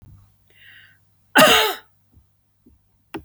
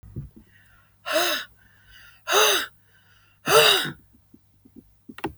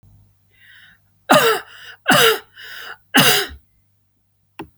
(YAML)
cough_length: 3.2 s
cough_amplitude: 32768
cough_signal_mean_std_ratio: 0.28
exhalation_length: 5.4 s
exhalation_amplitude: 23494
exhalation_signal_mean_std_ratio: 0.39
three_cough_length: 4.8 s
three_cough_amplitude: 32768
three_cough_signal_mean_std_ratio: 0.38
survey_phase: beta (2021-08-13 to 2022-03-07)
age: 65+
gender: Female
wearing_mask: 'No'
symptom_none: true
smoker_status: Never smoked
respiratory_condition_asthma: false
respiratory_condition_other: false
recruitment_source: REACT
submission_delay: 1 day
covid_test_result: Negative
covid_test_method: RT-qPCR